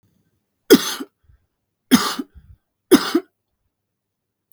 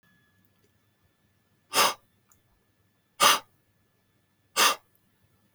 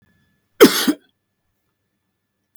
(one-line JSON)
{"three_cough_length": "4.5 s", "three_cough_amplitude": 32768, "three_cough_signal_mean_std_ratio": 0.26, "exhalation_length": "5.5 s", "exhalation_amplitude": 16949, "exhalation_signal_mean_std_ratio": 0.25, "cough_length": "2.6 s", "cough_amplitude": 32768, "cough_signal_mean_std_ratio": 0.23, "survey_phase": "beta (2021-08-13 to 2022-03-07)", "age": "45-64", "gender": "Male", "wearing_mask": "No", "symptom_none": true, "smoker_status": "Never smoked", "respiratory_condition_asthma": false, "respiratory_condition_other": false, "recruitment_source": "REACT", "submission_delay": "1 day", "covid_test_result": "Negative", "covid_test_method": "RT-qPCR", "influenza_a_test_result": "Negative", "influenza_b_test_result": "Negative"}